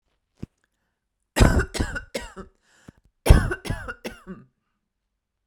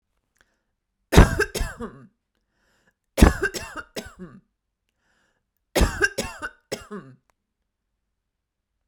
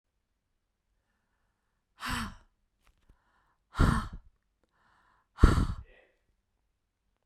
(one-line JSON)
{"cough_length": "5.5 s", "cough_amplitude": 32768, "cough_signal_mean_std_ratio": 0.28, "three_cough_length": "8.9 s", "three_cough_amplitude": 32768, "three_cough_signal_mean_std_ratio": 0.25, "exhalation_length": "7.3 s", "exhalation_amplitude": 18050, "exhalation_signal_mean_std_ratio": 0.23, "survey_phase": "beta (2021-08-13 to 2022-03-07)", "age": "45-64", "gender": "Female", "wearing_mask": "No", "symptom_none": true, "smoker_status": "Ex-smoker", "respiratory_condition_asthma": false, "respiratory_condition_other": false, "recruitment_source": "REACT", "submission_delay": "4 days", "covid_test_result": "Negative", "covid_test_method": "RT-qPCR"}